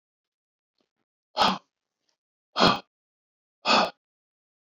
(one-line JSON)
{"exhalation_length": "4.6 s", "exhalation_amplitude": 22156, "exhalation_signal_mean_std_ratio": 0.28, "survey_phase": "beta (2021-08-13 to 2022-03-07)", "age": "65+", "gender": "Male", "wearing_mask": "No", "symptom_none": true, "smoker_status": "Ex-smoker", "respiratory_condition_asthma": false, "respiratory_condition_other": false, "recruitment_source": "REACT", "submission_delay": "2 days", "covid_test_result": "Negative", "covid_test_method": "RT-qPCR"}